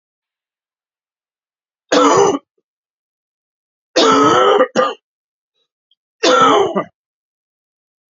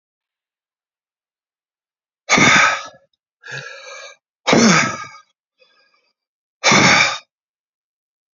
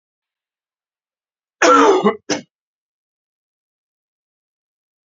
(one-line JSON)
{"three_cough_length": "8.1 s", "three_cough_amplitude": 31034, "three_cough_signal_mean_std_ratio": 0.41, "exhalation_length": "8.4 s", "exhalation_amplitude": 32768, "exhalation_signal_mean_std_ratio": 0.36, "cough_length": "5.1 s", "cough_amplitude": 28290, "cough_signal_mean_std_ratio": 0.27, "survey_phase": "beta (2021-08-13 to 2022-03-07)", "age": "45-64", "gender": "Male", "wearing_mask": "No", "symptom_cough_any": true, "symptom_runny_or_blocked_nose": true, "symptom_onset": "3 days", "smoker_status": "Never smoked", "respiratory_condition_asthma": false, "respiratory_condition_other": false, "recruitment_source": "Test and Trace", "submission_delay": "1 day", "covid_test_result": "Positive", "covid_test_method": "RT-qPCR", "covid_ct_value": 21.0, "covid_ct_gene": "N gene", "covid_ct_mean": 21.4, "covid_viral_load": "97000 copies/ml", "covid_viral_load_category": "Low viral load (10K-1M copies/ml)"}